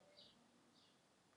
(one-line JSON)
{"exhalation_length": "1.4 s", "exhalation_amplitude": 81, "exhalation_signal_mean_std_ratio": 1.0, "survey_phase": "alpha (2021-03-01 to 2021-08-12)", "age": "18-44", "gender": "Female", "wearing_mask": "No", "symptom_cough_any": true, "symptom_fever_high_temperature": true, "symptom_headache": true, "smoker_status": "Never smoked", "respiratory_condition_asthma": false, "respiratory_condition_other": false, "recruitment_source": "Test and Trace", "submission_delay": "2 days", "covid_test_result": "Positive", "covid_test_method": "RT-qPCR", "covid_ct_value": 18.4, "covid_ct_gene": "ORF1ab gene", "covid_ct_mean": 18.8, "covid_viral_load": "670000 copies/ml", "covid_viral_load_category": "Low viral load (10K-1M copies/ml)"}